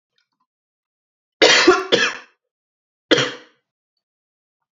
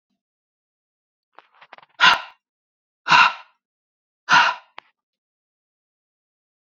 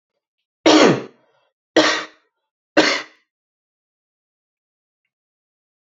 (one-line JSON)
{"cough_length": "4.8 s", "cough_amplitude": 29249, "cough_signal_mean_std_ratio": 0.31, "exhalation_length": "6.7 s", "exhalation_amplitude": 28746, "exhalation_signal_mean_std_ratio": 0.25, "three_cough_length": "5.8 s", "three_cough_amplitude": 28801, "three_cough_signal_mean_std_ratio": 0.29, "survey_phase": "beta (2021-08-13 to 2022-03-07)", "age": "18-44", "gender": "Male", "wearing_mask": "No", "symptom_none": true, "smoker_status": "Never smoked", "respiratory_condition_asthma": false, "respiratory_condition_other": false, "recruitment_source": "REACT", "submission_delay": "1 day", "covid_test_result": "Negative", "covid_test_method": "RT-qPCR"}